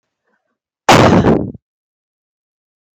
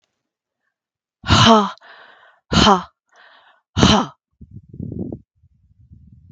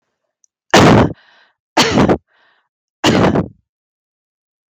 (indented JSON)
{
  "cough_length": "3.0 s",
  "cough_amplitude": 32768,
  "cough_signal_mean_std_ratio": 0.37,
  "exhalation_length": "6.3 s",
  "exhalation_amplitude": 32768,
  "exhalation_signal_mean_std_ratio": 0.34,
  "three_cough_length": "4.7 s",
  "three_cough_amplitude": 32768,
  "three_cough_signal_mean_std_ratio": 0.43,
  "survey_phase": "beta (2021-08-13 to 2022-03-07)",
  "age": "45-64",
  "gender": "Female",
  "wearing_mask": "No",
  "symptom_cough_any": true,
  "symptom_sore_throat": true,
  "symptom_onset": "7 days",
  "smoker_status": "Never smoked",
  "respiratory_condition_asthma": false,
  "respiratory_condition_other": false,
  "recruitment_source": "REACT",
  "submission_delay": "2 days",
  "covid_test_result": "Negative",
  "covid_test_method": "RT-qPCR",
  "influenza_a_test_result": "Negative",
  "influenza_b_test_result": "Negative"
}